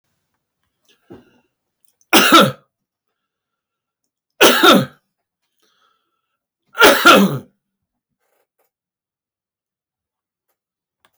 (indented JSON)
{
  "three_cough_length": "11.2 s",
  "three_cough_amplitude": 32768,
  "three_cough_signal_mean_std_ratio": 0.28,
  "survey_phase": "alpha (2021-03-01 to 2021-08-12)",
  "age": "65+",
  "gender": "Male",
  "wearing_mask": "No",
  "symptom_none": true,
  "smoker_status": "Ex-smoker",
  "respiratory_condition_asthma": false,
  "respiratory_condition_other": false,
  "recruitment_source": "REACT",
  "submission_delay": "5 days",
  "covid_test_result": "Negative",
  "covid_test_method": "RT-qPCR"
}